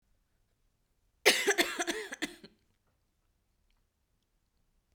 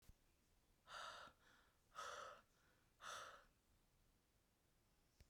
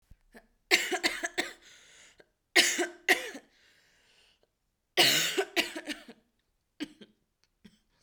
{
  "cough_length": "4.9 s",
  "cough_amplitude": 12886,
  "cough_signal_mean_std_ratio": 0.27,
  "exhalation_length": "5.3 s",
  "exhalation_amplitude": 234,
  "exhalation_signal_mean_std_ratio": 0.51,
  "three_cough_length": "8.0 s",
  "three_cough_amplitude": 13645,
  "three_cough_signal_mean_std_ratio": 0.35,
  "survey_phase": "beta (2021-08-13 to 2022-03-07)",
  "age": "18-44",
  "gender": "Female",
  "wearing_mask": "No",
  "symptom_cough_any": true,
  "symptom_new_continuous_cough": true,
  "symptom_sore_throat": true,
  "symptom_onset": "4 days",
  "smoker_status": "Never smoked",
  "respiratory_condition_asthma": false,
  "respiratory_condition_other": false,
  "recruitment_source": "Test and Trace",
  "submission_delay": "1 day",
  "covid_test_result": "Negative",
  "covid_test_method": "RT-qPCR"
}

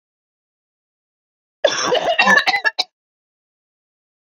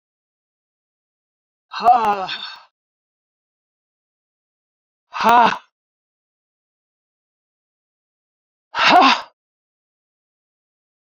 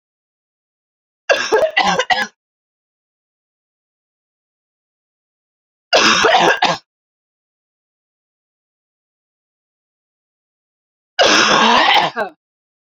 {
  "cough_length": "4.4 s",
  "cough_amplitude": 27214,
  "cough_signal_mean_std_ratio": 0.36,
  "exhalation_length": "11.2 s",
  "exhalation_amplitude": 29532,
  "exhalation_signal_mean_std_ratio": 0.26,
  "three_cough_length": "13.0 s",
  "three_cough_amplitude": 30726,
  "three_cough_signal_mean_std_ratio": 0.36,
  "survey_phase": "beta (2021-08-13 to 2022-03-07)",
  "age": "45-64",
  "gender": "Female",
  "wearing_mask": "No",
  "symptom_cough_any": true,
  "symptom_runny_or_blocked_nose": true,
  "symptom_shortness_of_breath": true,
  "symptom_abdominal_pain": true,
  "symptom_fatigue": true,
  "symptom_fever_high_temperature": true,
  "symptom_headache": true,
  "symptom_loss_of_taste": true,
  "symptom_other": true,
  "symptom_onset": "4 days",
  "smoker_status": "Never smoked",
  "respiratory_condition_asthma": true,
  "respiratory_condition_other": false,
  "recruitment_source": "Test and Trace",
  "submission_delay": "2 days",
  "covid_test_result": "Positive",
  "covid_test_method": "LAMP"
}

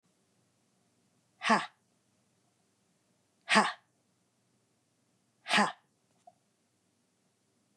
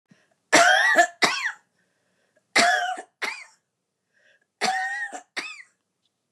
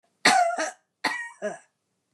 {
  "exhalation_length": "7.8 s",
  "exhalation_amplitude": 10271,
  "exhalation_signal_mean_std_ratio": 0.22,
  "three_cough_length": "6.3 s",
  "three_cough_amplitude": 25187,
  "three_cough_signal_mean_std_ratio": 0.42,
  "cough_length": "2.1 s",
  "cough_amplitude": 18000,
  "cough_signal_mean_std_ratio": 0.45,
  "survey_phase": "beta (2021-08-13 to 2022-03-07)",
  "age": "45-64",
  "gender": "Female",
  "wearing_mask": "No",
  "symptom_none": true,
  "smoker_status": "Ex-smoker",
  "respiratory_condition_asthma": false,
  "respiratory_condition_other": false,
  "recruitment_source": "Test and Trace",
  "submission_delay": "2 days",
  "covid_test_result": "Negative",
  "covid_test_method": "RT-qPCR"
}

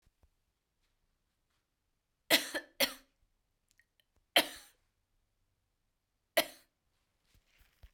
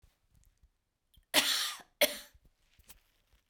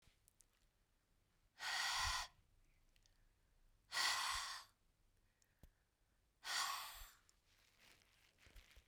{
  "three_cough_length": "7.9 s",
  "three_cough_amplitude": 9386,
  "three_cough_signal_mean_std_ratio": 0.18,
  "cough_length": "3.5 s",
  "cough_amplitude": 9170,
  "cough_signal_mean_std_ratio": 0.29,
  "exhalation_length": "8.9 s",
  "exhalation_amplitude": 1431,
  "exhalation_signal_mean_std_ratio": 0.4,
  "survey_phase": "beta (2021-08-13 to 2022-03-07)",
  "age": "45-64",
  "gender": "Female",
  "wearing_mask": "No",
  "symptom_shortness_of_breath": true,
  "symptom_abdominal_pain": true,
  "symptom_fatigue": true,
  "smoker_status": "Never smoked",
  "respiratory_condition_asthma": false,
  "respiratory_condition_other": false,
  "recruitment_source": "REACT",
  "submission_delay": "1 day",
  "covid_test_result": "Negative",
  "covid_test_method": "RT-qPCR"
}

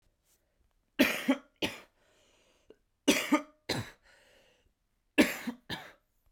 {
  "three_cough_length": "6.3 s",
  "three_cough_amplitude": 11562,
  "three_cough_signal_mean_std_ratio": 0.31,
  "survey_phase": "beta (2021-08-13 to 2022-03-07)",
  "age": "18-44",
  "gender": "Male",
  "wearing_mask": "No",
  "symptom_cough_any": true,
  "symptom_diarrhoea": true,
  "symptom_fatigue": true,
  "symptom_headache": true,
  "symptom_onset": "3 days",
  "smoker_status": "Never smoked",
  "respiratory_condition_asthma": true,
  "respiratory_condition_other": false,
  "recruitment_source": "Test and Trace",
  "submission_delay": "2 days",
  "covid_test_result": "Positive",
  "covid_test_method": "RT-qPCR",
  "covid_ct_value": 19.2,
  "covid_ct_gene": "ORF1ab gene"
}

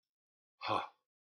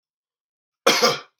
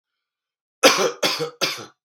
{
  "exhalation_length": "1.4 s",
  "exhalation_amplitude": 2812,
  "exhalation_signal_mean_std_ratio": 0.3,
  "cough_length": "1.4 s",
  "cough_amplitude": 32309,
  "cough_signal_mean_std_ratio": 0.36,
  "three_cough_length": "2.0 s",
  "three_cough_amplitude": 32768,
  "three_cough_signal_mean_std_ratio": 0.42,
  "survey_phase": "beta (2021-08-13 to 2022-03-07)",
  "age": "18-44",
  "gender": "Male",
  "wearing_mask": "No",
  "symptom_runny_or_blocked_nose": true,
  "symptom_onset": "11 days",
  "smoker_status": "Ex-smoker",
  "respiratory_condition_asthma": true,
  "respiratory_condition_other": false,
  "recruitment_source": "REACT",
  "submission_delay": "7 days",
  "covid_test_result": "Negative",
  "covid_test_method": "RT-qPCR"
}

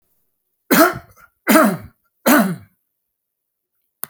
{
  "three_cough_length": "4.1 s",
  "three_cough_amplitude": 32767,
  "three_cough_signal_mean_std_ratio": 0.37,
  "survey_phase": "alpha (2021-03-01 to 2021-08-12)",
  "age": "45-64",
  "gender": "Male",
  "wearing_mask": "No",
  "symptom_none": true,
  "smoker_status": "Ex-smoker",
  "respiratory_condition_asthma": false,
  "respiratory_condition_other": false,
  "recruitment_source": "REACT",
  "submission_delay": "5 days",
  "covid_test_result": "Negative",
  "covid_test_method": "RT-qPCR"
}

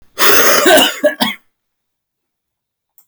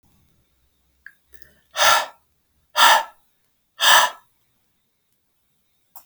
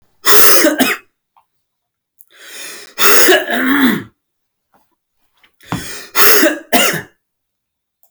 {
  "cough_length": "3.1 s",
  "cough_amplitude": 32768,
  "cough_signal_mean_std_ratio": 0.49,
  "exhalation_length": "6.1 s",
  "exhalation_amplitude": 32276,
  "exhalation_signal_mean_std_ratio": 0.29,
  "three_cough_length": "8.1 s",
  "three_cough_amplitude": 32768,
  "three_cough_signal_mean_std_ratio": 0.46,
  "survey_phase": "beta (2021-08-13 to 2022-03-07)",
  "age": "45-64",
  "gender": "Male",
  "wearing_mask": "No",
  "symptom_cough_any": true,
  "symptom_new_continuous_cough": true,
  "symptom_runny_or_blocked_nose": true,
  "symptom_shortness_of_breath": true,
  "symptom_sore_throat": true,
  "symptom_headache": true,
  "symptom_change_to_sense_of_smell_or_taste": true,
  "symptom_loss_of_taste": true,
  "symptom_onset": "4 days",
  "smoker_status": "Ex-smoker",
  "respiratory_condition_asthma": false,
  "respiratory_condition_other": false,
  "recruitment_source": "Test and Trace",
  "submission_delay": "2 days",
  "covid_test_result": "Positive",
  "covid_test_method": "RT-qPCR",
  "covid_ct_value": 21.8,
  "covid_ct_gene": "N gene",
  "covid_ct_mean": 22.3,
  "covid_viral_load": "50000 copies/ml",
  "covid_viral_load_category": "Low viral load (10K-1M copies/ml)"
}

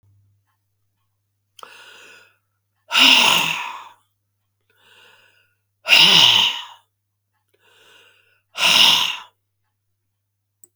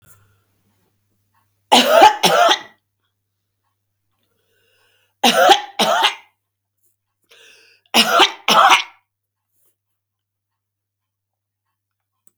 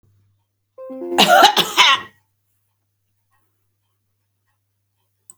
{
  "exhalation_length": "10.8 s",
  "exhalation_amplitude": 32768,
  "exhalation_signal_mean_std_ratio": 0.34,
  "three_cough_length": "12.4 s",
  "three_cough_amplitude": 32768,
  "three_cough_signal_mean_std_ratio": 0.33,
  "cough_length": "5.4 s",
  "cough_amplitude": 32768,
  "cough_signal_mean_std_ratio": 0.3,
  "survey_phase": "beta (2021-08-13 to 2022-03-07)",
  "age": "65+",
  "gender": "Female",
  "wearing_mask": "No",
  "symptom_sore_throat": true,
  "symptom_abdominal_pain": true,
  "symptom_fatigue": true,
  "symptom_change_to_sense_of_smell_or_taste": true,
  "symptom_other": true,
  "symptom_onset": "12 days",
  "smoker_status": "Never smoked",
  "respiratory_condition_asthma": false,
  "respiratory_condition_other": false,
  "recruitment_source": "REACT",
  "submission_delay": "2 days",
  "covid_test_result": "Negative",
  "covid_test_method": "RT-qPCR",
  "influenza_a_test_result": "Negative",
  "influenza_b_test_result": "Negative"
}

